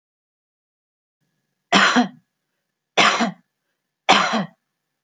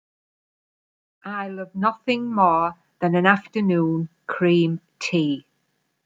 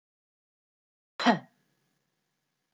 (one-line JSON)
{"three_cough_length": "5.0 s", "three_cough_amplitude": 29586, "three_cough_signal_mean_std_ratio": 0.35, "exhalation_length": "6.1 s", "exhalation_amplitude": 26364, "exhalation_signal_mean_std_ratio": 0.55, "cough_length": "2.7 s", "cough_amplitude": 9627, "cough_signal_mean_std_ratio": 0.18, "survey_phase": "alpha (2021-03-01 to 2021-08-12)", "age": "45-64", "gender": "Female", "wearing_mask": "No", "symptom_none": true, "smoker_status": "Never smoked", "respiratory_condition_asthma": false, "respiratory_condition_other": false, "recruitment_source": "REACT", "submission_delay": "5 days", "covid_test_result": "Negative", "covid_test_method": "RT-qPCR"}